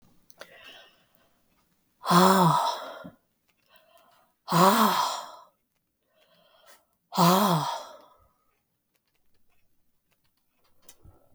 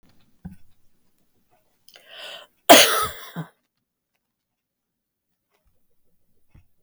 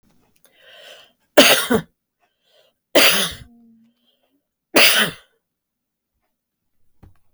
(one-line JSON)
{"exhalation_length": "11.3 s", "exhalation_amplitude": 20179, "exhalation_signal_mean_std_ratio": 0.34, "cough_length": "6.8 s", "cough_amplitude": 32768, "cough_signal_mean_std_ratio": 0.19, "three_cough_length": "7.3 s", "three_cough_amplitude": 32768, "three_cough_signal_mean_std_ratio": 0.3, "survey_phase": "beta (2021-08-13 to 2022-03-07)", "age": "65+", "gender": "Female", "wearing_mask": "No", "symptom_none": true, "smoker_status": "Never smoked", "respiratory_condition_asthma": false, "respiratory_condition_other": false, "recruitment_source": "REACT", "submission_delay": "2 days", "covid_test_result": "Negative", "covid_test_method": "RT-qPCR", "influenza_a_test_result": "Unknown/Void", "influenza_b_test_result": "Unknown/Void"}